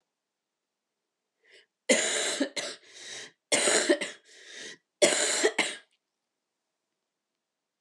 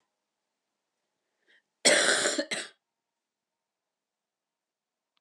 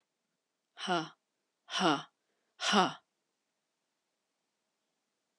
three_cough_length: 7.8 s
three_cough_amplitude: 15466
three_cough_signal_mean_std_ratio: 0.39
cough_length: 5.2 s
cough_amplitude: 16927
cough_signal_mean_std_ratio: 0.27
exhalation_length: 5.4 s
exhalation_amplitude: 8253
exhalation_signal_mean_std_ratio: 0.29
survey_phase: beta (2021-08-13 to 2022-03-07)
age: 18-44
gender: Female
wearing_mask: 'No'
symptom_new_continuous_cough: true
symptom_sore_throat: true
symptom_fatigue: true
symptom_change_to_sense_of_smell_or_taste: true
symptom_loss_of_taste: true
symptom_onset: 4 days
smoker_status: Never smoked
respiratory_condition_asthma: false
respiratory_condition_other: false
recruitment_source: Test and Trace
submission_delay: 2 days
covid_test_result: Positive
covid_test_method: RT-qPCR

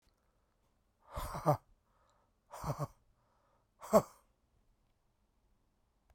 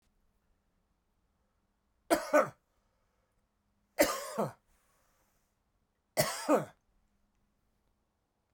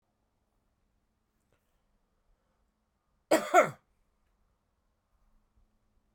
exhalation_length: 6.1 s
exhalation_amplitude: 7331
exhalation_signal_mean_std_ratio: 0.22
three_cough_length: 8.5 s
three_cough_amplitude: 8456
three_cough_signal_mean_std_ratio: 0.26
cough_length: 6.1 s
cough_amplitude: 11135
cough_signal_mean_std_ratio: 0.16
survey_phase: beta (2021-08-13 to 2022-03-07)
age: 45-64
gender: Male
wearing_mask: 'No'
symptom_cough_any: true
symptom_runny_or_blocked_nose: true
symptom_sore_throat: true
symptom_abdominal_pain: true
symptom_fatigue: true
symptom_headache: true
symptom_onset: 2 days
smoker_status: Never smoked
respiratory_condition_asthma: false
respiratory_condition_other: false
recruitment_source: Test and Trace
submission_delay: 2 days
covid_test_result: Positive
covid_test_method: RT-qPCR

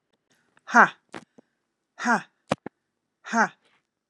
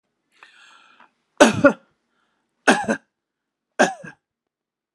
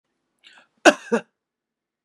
exhalation_length: 4.1 s
exhalation_amplitude: 28853
exhalation_signal_mean_std_ratio: 0.24
three_cough_length: 4.9 s
three_cough_amplitude: 32767
three_cough_signal_mean_std_ratio: 0.25
cough_length: 2.0 s
cough_amplitude: 32461
cough_signal_mean_std_ratio: 0.19
survey_phase: beta (2021-08-13 to 2022-03-07)
age: 45-64
gender: Female
wearing_mask: 'No'
symptom_none: true
smoker_status: Never smoked
respiratory_condition_asthma: true
respiratory_condition_other: false
recruitment_source: REACT
submission_delay: 3 days
covid_test_result: Negative
covid_test_method: RT-qPCR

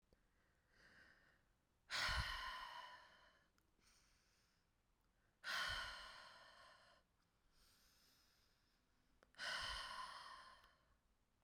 exhalation_length: 11.4 s
exhalation_amplitude: 823
exhalation_signal_mean_std_ratio: 0.43
survey_phase: beta (2021-08-13 to 2022-03-07)
age: 45-64
gender: Female
wearing_mask: 'No'
symptom_cough_any: true
symptom_runny_or_blocked_nose: true
symptom_fatigue: true
symptom_change_to_sense_of_smell_or_taste: true
symptom_loss_of_taste: true
symptom_onset: 8 days
smoker_status: Never smoked
respiratory_condition_asthma: false
respiratory_condition_other: false
recruitment_source: Test and Trace
submission_delay: 2 days
covid_test_result: Positive
covid_test_method: LAMP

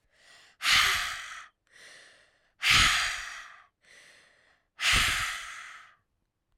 exhalation_length: 6.6 s
exhalation_amplitude: 11856
exhalation_signal_mean_std_ratio: 0.44
survey_phase: alpha (2021-03-01 to 2021-08-12)
age: 45-64
gender: Female
wearing_mask: 'No'
symptom_fatigue: true
smoker_status: Ex-smoker
respiratory_condition_asthma: false
respiratory_condition_other: false
recruitment_source: Test and Trace
submission_delay: 2 days
covid_test_result: Positive
covid_test_method: RT-qPCR
covid_ct_value: 15.6
covid_ct_gene: ORF1ab gene
covid_ct_mean: 16.3
covid_viral_load: 4500000 copies/ml
covid_viral_load_category: High viral load (>1M copies/ml)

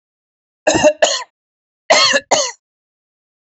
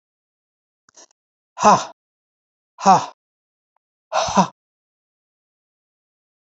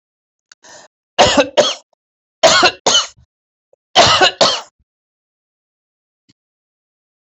cough_length: 3.4 s
cough_amplitude: 32535
cough_signal_mean_std_ratio: 0.42
exhalation_length: 6.6 s
exhalation_amplitude: 28874
exhalation_signal_mean_std_ratio: 0.24
three_cough_length: 7.3 s
three_cough_amplitude: 32768
three_cough_signal_mean_std_ratio: 0.36
survey_phase: beta (2021-08-13 to 2022-03-07)
age: 65+
gender: Female
wearing_mask: 'No'
symptom_none: true
smoker_status: Ex-smoker
respiratory_condition_asthma: false
respiratory_condition_other: false
recruitment_source: REACT
submission_delay: 4 days
covid_test_result: Negative
covid_test_method: RT-qPCR
influenza_a_test_result: Negative
influenza_b_test_result: Negative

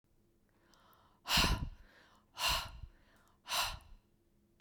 exhalation_length: 4.6 s
exhalation_amplitude: 4703
exhalation_signal_mean_std_ratio: 0.39
survey_phase: beta (2021-08-13 to 2022-03-07)
age: 45-64
gender: Female
wearing_mask: 'No'
symptom_none: true
smoker_status: Never smoked
respiratory_condition_asthma: false
respiratory_condition_other: false
recruitment_source: REACT
submission_delay: 1 day
covid_test_result: Negative
covid_test_method: RT-qPCR
influenza_a_test_result: Negative
influenza_b_test_result: Negative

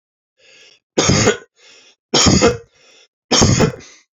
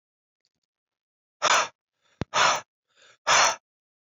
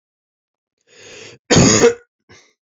three_cough_length: 4.2 s
three_cough_amplitude: 30090
three_cough_signal_mean_std_ratio: 0.46
exhalation_length: 4.1 s
exhalation_amplitude: 14583
exhalation_signal_mean_std_ratio: 0.34
cough_length: 2.6 s
cough_amplitude: 29063
cough_signal_mean_std_ratio: 0.35
survey_phase: beta (2021-08-13 to 2022-03-07)
age: 18-44
gender: Male
wearing_mask: 'No'
symptom_none: true
smoker_status: Never smoked
respiratory_condition_asthma: false
respiratory_condition_other: false
recruitment_source: REACT
submission_delay: 1 day
covid_test_result: Negative
covid_test_method: RT-qPCR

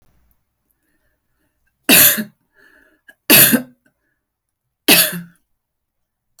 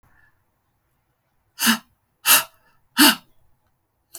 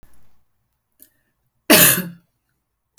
three_cough_length: 6.4 s
three_cough_amplitude: 32768
three_cough_signal_mean_std_ratio: 0.29
exhalation_length: 4.2 s
exhalation_amplitude: 32768
exhalation_signal_mean_std_ratio: 0.27
cough_length: 3.0 s
cough_amplitude: 32768
cough_signal_mean_std_ratio: 0.27
survey_phase: alpha (2021-03-01 to 2021-08-12)
age: 45-64
gender: Female
wearing_mask: 'No'
symptom_none: true
smoker_status: Ex-smoker
respiratory_condition_asthma: false
respiratory_condition_other: false
recruitment_source: REACT
submission_delay: 1 day
covid_test_result: Negative
covid_test_method: RT-qPCR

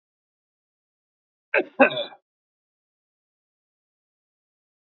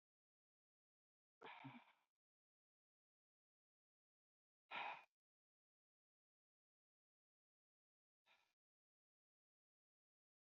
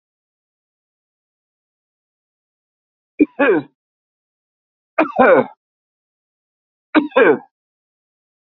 cough_length: 4.9 s
cough_amplitude: 24126
cough_signal_mean_std_ratio: 0.17
exhalation_length: 10.6 s
exhalation_amplitude: 475
exhalation_signal_mean_std_ratio: 0.18
three_cough_length: 8.4 s
three_cough_amplitude: 28824
three_cough_signal_mean_std_ratio: 0.27
survey_phase: beta (2021-08-13 to 2022-03-07)
age: 65+
gender: Male
wearing_mask: 'No'
symptom_cough_any: true
symptom_runny_or_blocked_nose: true
symptom_onset: 12 days
smoker_status: Ex-smoker
respiratory_condition_asthma: false
respiratory_condition_other: false
recruitment_source: REACT
submission_delay: 3 days
covid_test_result: Positive
covid_test_method: RT-qPCR
covid_ct_value: 23.6
covid_ct_gene: E gene
influenza_a_test_result: Negative
influenza_b_test_result: Negative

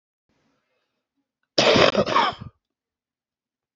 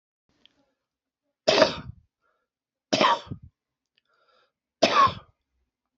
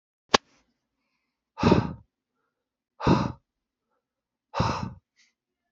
cough_length: 3.8 s
cough_amplitude: 32767
cough_signal_mean_std_ratio: 0.34
three_cough_length: 6.0 s
three_cough_amplitude: 26105
three_cough_signal_mean_std_ratio: 0.29
exhalation_length: 5.7 s
exhalation_amplitude: 27376
exhalation_signal_mean_std_ratio: 0.28
survey_phase: beta (2021-08-13 to 2022-03-07)
age: 45-64
gender: Male
wearing_mask: 'No'
symptom_cough_any: true
symptom_runny_or_blocked_nose: true
symptom_sore_throat: true
symptom_fatigue: true
symptom_onset: 3 days
smoker_status: Never smoked
respiratory_condition_asthma: true
respiratory_condition_other: false
recruitment_source: Test and Trace
submission_delay: 2 days
covid_test_result: Positive
covid_test_method: RT-qPCR
covid_ct_value: 13.9
covid_ct_gene: ORF1ab gene
covid_ct_mean: 14.3
covid_viral_load: 20000000 copies/ml
covid_viral_load_category: High viral load (>1M copies/ml)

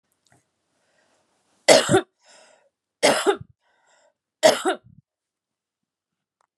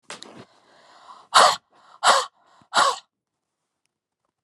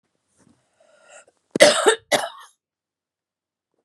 three_cough_length: 6.6 s
three_cough_amplitude: 32767
three_cough_signal_mean_std_ratio: 0.27
exhalation_length: 4.4 s
exhalation_amplitude: 30668
exhalation_signal_mean_std_ratio: 0.3
cough_length: 3.8 s
cough_amplitude: 32768
cough_signal_mean_std_ratio: 0.26
survey_phase: beta (2021-08-13 to 2022-03-07)
age: 65+
gender: Female
wearing_mask: 'No'
symptom_none: true
smoker_status: Never smoked
respiratory_condition_asthma: false
respiratory_condition_other: false
recruitment_source: REACT
submission_delay: 2 days
covid_test_result: Negative
covid_test_method: RT-qPCR
influenza_a_test_result: Negative
influenza_b_test_result: Negative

